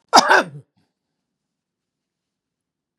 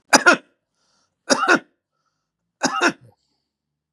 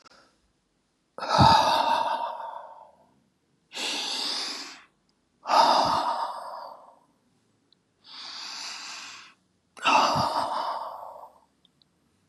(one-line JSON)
{"cough_length": "3.0 s", "cough_amplitude": 32768, "cough_signal_mean_std_ratio": 0.23, "three_cough_length": "3.9 s", "three_cough_amplitude": 32768, "three_cough_signal_mean_std_ratio": 0.3, "exhalation_length": "12.3 s", "exhalation_amplitude": 18872, "exhalation_signal_mean_std_ratio": 0.47, "survey_phase": "beta (2021-08-13 to 2022-03-07)", "age": "65+", "gender": "Male", "wearing_mask": "No", "symptom_none": true, "smoker_status": "Never smoked", "respiratory_condition_asthma": true, "respiratory_condition_other": false, "recruitment_source": "REACT", "submission_delay": "2 days", "covid_test_result": "Negative", "covid_test_method": "RT-qPCR", "influenza_a_test_result": "Negative", "influenza_b_test_result": "Negative"}